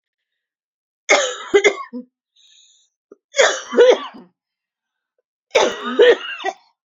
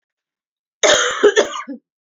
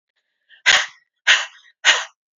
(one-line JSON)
{"three_cough_length": "6.9 s", "three_cough_amplitude": 29586, "three_cough_signal_mean_std_ratio": 0.37, "cough_length": "2.0 s", "cough_amplitude": 29701, "cough_signal_mean_std_ratio": 0.45, "exhalation_length": "2.4 s", "exhalation_amplitude": 32767, "exhalation_signal_mean_std_ratio": 0.36, "survey_phase": "beta (2021-08-13 to 2022-03-07)", "age": "18-44", "gender": "Female", "wearing_mask": "No", "symptom_cough_any": true, "symptom_new_continuous_cough": true, "symptom_runny_or_blocked_nose": true, "symptom_shortness_of_breath": true, "symptom_fatigue": true, "smoker_status": "Never smoked", "respiratory_condition_asthma": true, "respiratory_condition_other": false, "recruitment_source": "Test and Trace", "submission_delay": "2 days", "covid_test_result": "Positive", "covid_test_method": "LFT"}